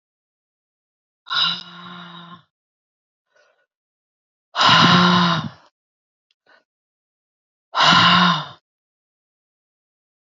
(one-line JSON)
{"exhalation_length": "10.3 s", "exhalation_amplitude": 29144, "exhalation_signal_mean_std_ratio": 0.35, "survey_phase": "beta (2021-08-13 to 2022-03-07)", "age": "45-64", "gender": "Female", "wearing_mask": "No", "symptom_cough_any": true, "symptom_runny_or_blocked_nose": true, "symptom_sore_throat": true, "smoker_status": "Ex-smoker", "respiratory_condition_asthma": false, "respiratory_condition_other": false, "recruitment_source": "REACT", "submission_delay": "1 day", "covid_test_result": "Negative", "covid_test_method": "RT-qPCR", "influenza_a_test_result": "Negative", "influenza_b_test_result": "Negative"}